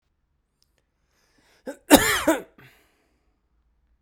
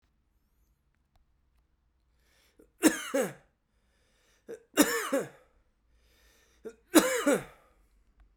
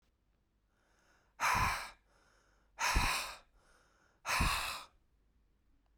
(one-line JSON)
{"cough_length": "4.0 s", "cough_amplitude": 32768, "cough_signal_mean_std_ratio": 0.23, "three_cough_length": "8.4 s", "three_cough_amplitude": 23721, "three_cough_signal_mean_std_ratio": 0.28, "exhalation_length": "6.0 s", "exhalation_amplitude": 3730, "exhalation_signal_mean_std_ratio": 0.42, "survey_phase": "beta (2021-08-13 to 2022-03-07)", "age": "18-44", "gender": "Male", "wearing_mask": "No", "symptom_cough_any": true, "symptom_runny_or_blocked_nose": true, "symptom_shortness_of_breath": true, "symptom_sore_throat": true, "symptom_fatigue": true, "symptom_fever_high_temperature": true, "symptom_headache": true, "symptom_change_to_sense_of_smell_or_taste": true, "symptom_onset": "3 days", "smoker_status": "Never smoked", "respiratory_condition_asthma": true, "respiratory_condition_other": false, "recruitment_source": "Test and Trace", "submission_delay": "1 day", "covid_test_result": "Positive", "covid_test_method": "RT-qPCR"}